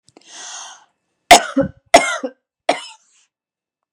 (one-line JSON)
{"three_cough_length": "3.9 s", "three_cough_amplitude": 32768, "three_cough_signal_mean_std_ratio": 0.27, "survey_phase": "beta (2021-08-13 to 2022-03-07)", "age": "45-64", "gender": "Female", "wearing_mask": "No", "symptom_none": true, "symptom_onset": "12 days", "smoker_status": "Ex-smoker", "respiratory_condition_asthma": true, "respiratory_condition_other": false, "recruitment_source": "REACT", "submission_delay": "3 days", "covid_test_result": "Negative", "covid_test_method": "RT-qPCR", "influenza_a_test_result": "Negative", "influenza_b_test_result": "Negative"}